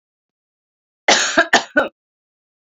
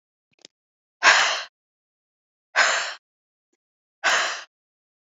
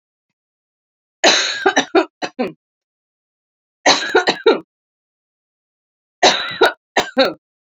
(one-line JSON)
{"cough_length": "2.6 s", "cough_amplitude": 32767, "cough_signal_mean_std_ratio": 0.34, "exhalation_length": "5.0 s", "exhalation_amplitude": 29072, "exhalation_signal_mean_std_ratio": 0.34, "three_cough_length": "7.8 s", "three_cough_amplitude": 32767, "three_cough_signal_mean_std_ratio": 0.37, "survey_phase": "beta (2021-08-13 to 2022-03-07)", "age": "18-44", "gender": "Female", "wearing_mask": "No", "symptom_fatigue": true, "symptom_onset": "12 days", "smoker_status": "Never smoked", "respiratory_condition_asthma": false, "respiratory_condition_other": false, "recruitment_source": "REACT", "submission_delay": "2 days", "covid_test_result": "Negative", "covid_test_method": "RT-qPCR"}